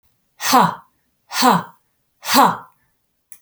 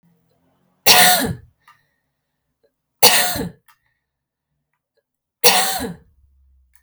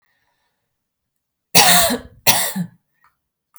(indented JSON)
{
  "exhalation_length": "3.4 s",
  "exhalation_amplitude": 30760,
  "exhalation_signal_mean_std_ratio": 0.4,
  "three_cough_length": "6.8 s",
  "three_cough_amplitude": 32768,
  "three_cough_signal_mean_std_ratio": 0.32,
  "cough_length": "3.6 s",
  "cough_amplitude": 32768,
  "cough_signal_mean_std_ratio": 0.35,
  "survey_phase": "beta (2021-08-13 to 2022-03-07)",
  "age": "45-64",
  "gender": "Female",
  "wearing_mask": "No",
  "symptom_none": true,
  "smoker_status": "Ex-smoker",
  "respiratory_condition_asthma": false,
  "respiratory_condition_other": false,
  "recruitment_source": "REACT",
  "submission_delay": "8 days",
  "covid_test_result": "Negative",
  "covid_test_method": "RT-qPCR"
}